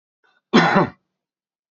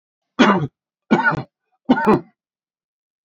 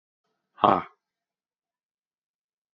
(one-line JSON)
{"cough_length": "1.7 s", "cough_amplitude": 27351, "cough_signal_mean_std_ratio": 0.35, "three_cough_length": "3.2 s", "three_cough_amplitude": 27656, "three_cough_signal_mean_std_ratio": 0.4, "exhalation_length": "2.7 s", "exhalation_amplitude": 23774, "exhalation_signal_mean_std_ratio": 0.17, "survey_phase": "beta (2021-08-13 to 2022-03-07)", "age": "45-64", "gender": "Male", "wearing_mask": "No", "symptom_none": true, "smoker_status": "Never smoked", "respiratory_condition_asthma": false, "respiratory_condition_other": false, "recruitment_source": "REACT", "submission_delay": "8 days", "covid_test_result": "Negative", "covid_test_method": "RT-qPCR", "influenza_a_test_result": "Negative", "influenza_b_test_result": "Negative"}